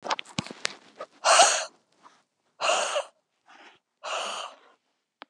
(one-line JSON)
{"exhalation_length": "5.3 s", "exhalation_amplitude": 28257, "exhalation_signal_mean_std_ratio": 0.37, "survey_phase": "beta (2021-08-13 to 2022-03-07)", "age": "45-64", "gender": "Female", "wearing_mask": "No", "symptom_none": true, "smoker_status": "Never smoked", "respiratory_condition_asthma": false, "respiratory_condition_other": false, "recruitment_source": "REACT", "submission_delay": "2 days", "covid_test_result": "Negative", "covid_test_method": "RT-qPCR", "influenza_a_test_result": "Negative", "influenza_b_test_result": "Negative"}